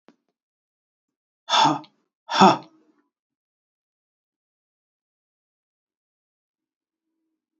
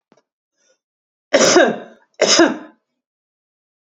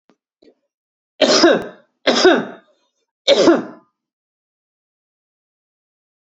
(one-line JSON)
{"exhalation_length": "7.6 s", "exhalation_amplitude": 27747, "exhalation_signal_mean_std_ratio": 0.19, "cough_length": "3.9 s", "cough_amplitude": 30541, "cough_signal_mean_std_ratio": 0.36, "three_cough_length": "6.4 s", "three_cough_amplitude": 29367, "three_cough_signal_mean_std_ratio": 0.34, "survey_phase": "beta (2021-08-13 to 2022-03-07)", "age": "18-44", "gender": "Male", "wearing_mask": "No", "symptom_none": true, "smoker_status": "Never smoked", "respiratory_condition_asthma": false, "respiratory_condition_other": false, "recruitment_source": "REACT", "submission_delay": "2 days", "covid_test_result": "Negative", "covid_test_method": "RT-qPCR", "influenza_a_test_result": "Negative", "influenza_b_test_result": "Negative"}